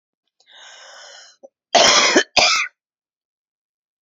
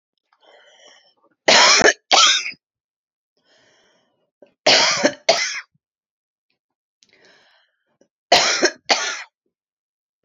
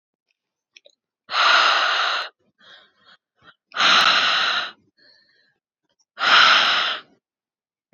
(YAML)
cough_length: 4.0 s
cough_amplitude: 32631
cough_signal_mean_std_ratio: 0.37
three_cough_length: 10.2 s
three_cough_amplitude: 32767
three_cough_signal_mean_std_ratio: 0.35
exhalation_length: 7.9 s
exhalation_amplitude: 26928
exhalation_signal_mean_std_ratio: 0.48
survey_phase: beta (2021-08-13 to 2022-03-07)
age: 45-64
gender: Female
wearing_mask: 'No'
symptom_headache: true
symptom_onset: 5 days
smoker_status: Current smoker (11 or more cigarettes per day)
respiratory_condition_asthma: true
respiratory_condition_other: false
recruitment_source: REACT
submission_delay: 2 days
covid_test_result: Negative
covid_test_method: RT-qPCR
influenza_a_test_result: Negative
influenza_b_test_result: Negative